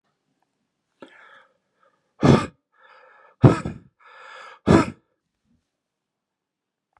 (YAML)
exhalation_length: 7.0 s
exhalation_amplitude: 32767
exhalation_signal_mean_std_ratio: 0.22
survey_phase: beta (2021-08-13 to 2022-03-07)
age: 45-64
gender: Male
wearing_mask: 'No'
symptom_none: true
smoker_status: Never smoked
respiratory_condition_asthma: false
respiratory_condition_other: false
recruitment_source: REACT
submission_delay: 13 days
covid_test_result: Negative
covid_test_method: RT-qPCR